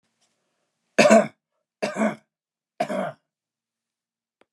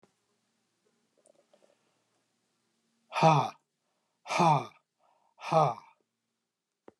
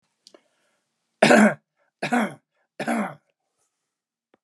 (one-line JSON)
{"cough_length": "4.5 s", "cough_amplitude": 30686, "cough_signal_mean_std_ratio": 0.29, "exhalation_length": "7.0 s", "exhalation_amplitude": 11296, "exhalation_signal_mean_std_ratio": 0.28, "three_cough_length": "4.4 s", "three_cough_amplitude": 28141, "three_cough_signal_mean_std_ratio": 0.31, "survey_phase": "alpha (2021-03-01 to 2021-08-12)", "age": "65+", "gender": "Male", "wearing_mask": "No", "symptom_none": true, "smoker_status": "Never smoked", "respiratory_condition_asthma": false, "respiratory_condition_other": false, "recruitment_source": "REACT", "submission_delay": "2 days", "covid_test_result": "Negative", "covid_test_method": "RT-qPCR"}